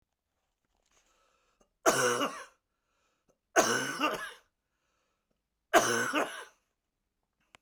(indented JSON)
{
  "three_cough_length": "7.6 s",
  "three_cough_amplitude": 14225,
  "three_cough_signal_mean_std_ratio": 0.35,
  "survey_phase": "beta (2021-08-13 to 2022-03-07)",
  "age": "65+",
  "gender": "Male",
  "wearing_mask": "No",
  "symptom_cough_any": true,
  "symptom_runny_or_blocked_nose": true,
  "symptom_fatigue": true,
  "symptom_loss_of_taste": true,
  "symptom_onset": "2 days",
  "smoker_status": "Never smoked",
  "respiratory_condition_asthma": false,
  "respiratory_condition_other": false,
  "recruitment_source": "Test and Trace",
  "submission_delay": "1 day",
  "covid_test_result": "Positive",
  "covid_test_method": "RT-qPCR",
  "covid_ct_value": 17.3,
  "covid_ct_gene": "ORF1ab gene",
  "covid_ct_mean": 17.6,
  "covid_viral_load": "1700000 copies/ml",
  "covid_viral_load_category": "High viral load (>1M copies/ml)"
}